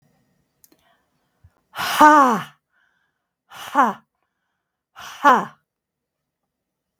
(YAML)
exhalation_length: 7.0 s
exhalation_amplitude: 32766
exhalation_signal_mean_std_ratio: 0.29
survey_phase: beta (2021-08-13 to 2022-03-07)
age: 65+
gender: Female
wearing_mask: 'No'
symptom_none: true
smoker_status: Ex-smoker
respiratory_condition_asthma: false
respiratory_condition_other: false
recruitment_source: REACT
submission_delay: 1 day
covid_test_result: Negative
covid_test_method: RT-qPCR
influenza_a_test_result: Negative
influenza_b_test_result: Negative